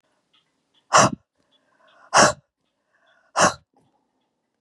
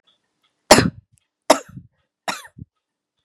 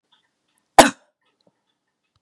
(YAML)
exhalation_length: 4.6 s
exhalation_amplitude: 28322
exhalation_signal_mean_std_ratio: 0.26
three_cough_length: 3.2 s
three_cough_amplitude: 32768
three_cough_signal_mean_std_ratio: 0.22
cough_length: 2.2 s
cough_amplitude: 32768
cough_signal_mean_std_ratio: 0.15
survey_phase: beta (2021-08-13 to 2022-03-07)
age: 45-64
gender: Female
wearing_mask: 'No'
symptom_none: true
smoker_status: Never smoked
respiratory_condition_asthma: false
respiratory_condition_other: false
recruitment_source: Test and Trace
submission_delay: -1 day
covid_test_result: Negative
covid_test_method: LFT